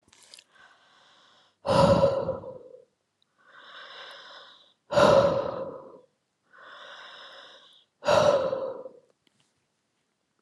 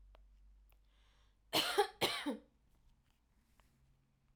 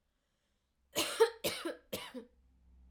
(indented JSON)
{
  "exhalation_length": "10.4 s",
  "exhalation_amplitude": 19618,
  "exhalation_signal_mean_std_ratio": 0.38,
  "cough_length": "4.4 s",
  "cough_amplitude": 3523,
  "cough_signal_mean_std_ratio": 0.32,
  "three_cough_length": "2.9 s",
  "three_cough_amplitude": 6169,
  "three_cough_signal_mean_std_ratio": 0.35,
  "survey_phase": "alpha (2021-03-01 to 2021-08-12)",
  "age": "18-44",
  "gender": "Female",
  "wearing_mask": "No",
  "symptom_none": true,
  "smoker_status": "Never smoked",
  "respiratory_condition_asthma": false,
  "respiratory_condition_other": false,
  "recruitment_source": "REACT",
  "submission_delay": "1 day",
  "covid_test_result": "Negative",
  "covid_test_method": "RT-qPCR"
}